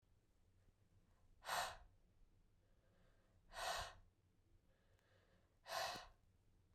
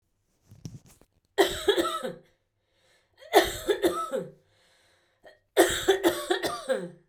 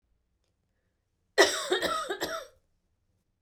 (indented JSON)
{
  "exhalation_length": "6.7 s",
  "exhalation_amplitude": 801,
  "exhalation_signal_mean_std_ratio": 0.39,
  "three_cough_length": "7.1 s",
  "three_cough_amplitude": 22432,
  "three_cough_signal_mean_std_ratio": 0.43,
  "cough_length": "3.4 s",
  "cough_amplitude": 14718,
  "cough_signal_mean_std_ratio": 0.35,
  "survey_phase": "beta (2021-08-13 to 2022-03-07)",
  "age": "45-64",
  "gender": "Female",
  "wearing_mask": "No",
  "symptom_none": true,
  "smoker_status": "Never smoked",
  "respiratory_condition_asthma": false,
  "respiratory_condition_other": false,
  "recruitment_source": "REACT",
  "submission_delay": "1 day",
  "covid_test_result": "Negative",
  "covid_test_method": "RT-qPCR"
}